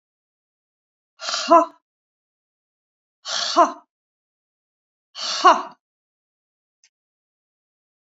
exhalation_length: 8.2 s
exhalation_amplitude: 29631
exhalation_signal_mean_std_ratio: 0.24
survey_phase: beta (2021-08-13 to 2022-03-07)
age: 65+
gender: Female
wearing_mask: 'No'
symptom_none: true
smoker_status: Ex-smoker
respiratory_condition_asthma: false
respiratory_condition_other: false
recruitment_source: REACT
submission_delay: 3 days
covid_test_result: Negative
covid_test_method: RT-qPCR
influenza_a_test_result: Negative
influenza_b_test_result: Negative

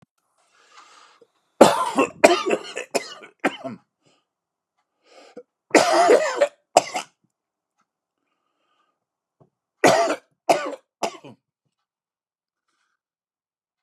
three_cough_length: 13.8 s
three_cough_amplitude: 32768
three_cough_signal_mean_std_ratio: 0.3
survey_phase: beta (2021-08-13 to 2022-03-07)
age: 45-64
gender: Male
wearing_mask: 'No'
symptom_cough_any: true
symptom_shortness_of_breath: true
symptom_fatigue: true
symptom_headache: true
symptom_change_to_sense_of_smell_or_taste: true
symptom_onset: 12 days
smoker_status: Never smoked
respiratory_condition_asthma: false
respiratory_condition_other: false
recruitment_source: REACT
submission_delay: 0 days
covid_test_result: Negative
covid_test_method: RT-qPCR
influenza_a_test_result: Negative
influenza_b_test_result: Negative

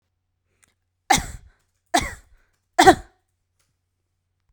three_cough_length: 4.5 s
three_cough_amplitude: 32768
three_cough_signal_mean_std_ratio: 0.22
survey_phase: beta (2021-08-13 to 2022-03-07)
age: 18-44
gender: Female
wearing_mask: 'No'
symptom_none: true
smoker_status: Never smoked
respiratory_condition_asthma: false
respiratory_condition_other: false
recruitment_source: REACT
submission_delay: 1 day
covid_test_result: Negative
covid_test_method: RT-qPCR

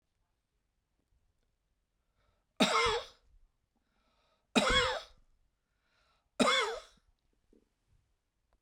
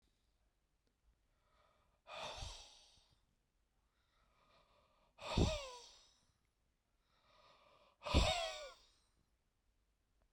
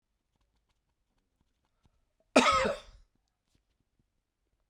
three_cough_length: 8.6 s
three_cough_amplitude: 7778
three_cough_signal_mean_std_ratio: 0.3
exhalation_length: 10.3 s
exhalation_amplitude: 3040
exhalation_signal_mean_std_ratio: 0.27
cough_length: 4.7 s
cough_amplitude: 11983
cough_signal_mean_std_ratio: 0.22
survey_phase: beta (2021-08-13 to 2022-03-07)
age: 45-64
gender: Male
wearing_mask: 'No'
symptom_diarrhoea: true
symptom_fatigue: true
smoker_status: Never smoked
respiratory_condition_asthma: false
respiratory_condition_other: false
recruitment_source: REACT
submission_delay: 1 day
covid_test_result: Negative
covid_test_method: RT-qPCR
influenza_a_test_result: Negative
influenza_b_test_result: Negative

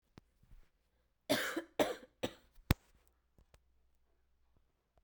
three_cough_length: 5.0 s
three_cough_amplitude: 8674
three_cough_signal_mean_std_ratio: 0.25
survey_phase: beta (2021-08-13 to 2022-03-07)
age: 18-44
gender: Female
wearing_mask: 'No'
symptom_cough_any: true
symptom_new_continuous_cough: true
symptom_runny_or_blocked_nose: true
symptom_shortness_of_breath: true
symptom_sore_throat: true
symptom_abdominal_pain: true
symptom_diarrhoea: true
symptom_fever_high_temperature: true
symptom_headache: true
symptom_change_to_sense_of_smell_or_taste: true
symptom_loss_of_taste: true
symptom_onset: 3 days
smoker_status: Never smoked
respiratory_condition_asthma: false
respiratory_condition_other: false
recruitment_source: Test and Trace
submission_delay: 2 days
covid_test_result: Positive
covid_test_method: RT-qPCR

